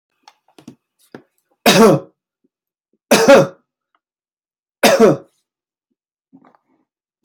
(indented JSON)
{
  "three_cough_length": "7.2 s",
  "three_cough_amplitude": 32767,
  "three_cough_signal_mean_std_ratio": 0.31,
  "survey_phase": "beta (2021-08-13 to 2022-03-07)",
  "age": "45-64",
  "gender": "Male",
  "wearing_mask": "No",
  "symptom_none": true,
  "smoker_status": "Never smoked",
  "respiratory_condition_asthma": false,
  "respiratory_condition_other": false,
  "recruitment_source": "REACT",
  "submission_delay": "2 days",
  "covid_test_result": "Negative",
  "covid_test_method": "RT-qPCR",
  "influenza_a_test_result": "Negative",
  "influenza_b_test_result": "Negative"
}